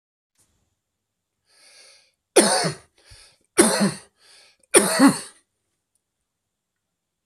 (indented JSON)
{
  "three_cough_length": "7.3 s",
  "three_cough_amplitude": 32768,
  "three_cough_signal_mean_std_ratio": 0.3,
  "survey_phase": "beta (2021-08-13 to 2022-03-07)",
  "age": "45-64",
  "gender": "Male",
  "wearing_mask": "No",
  "symptom_cough_any": true,
  "symptom_fatigue": true,
  "symptom_fever_high_temperature": true,
  "symptom_other": true,
  "symptom_onset": "7 days",
  "smoker_status": "Never smoked",
  "respiratory_condition_asthma": false,
  "respiratory_condition_other": false,
  "recruitment_source": "Test and Trace",
  "submission_delay": "2 days",
  "covid_test_result": "Positive",
  "covid_test_method": "RT-qPCR",
  "covid_ct_value": 12.8,
  "covid_ct_gene": "ORF1ab gene",
  "covid_ct_mean": 13.4,
  "covid_viral_load": "41000000 copies/ml",
  "covid_viral_load_category": "High viral load (>1M copies/ml)"
}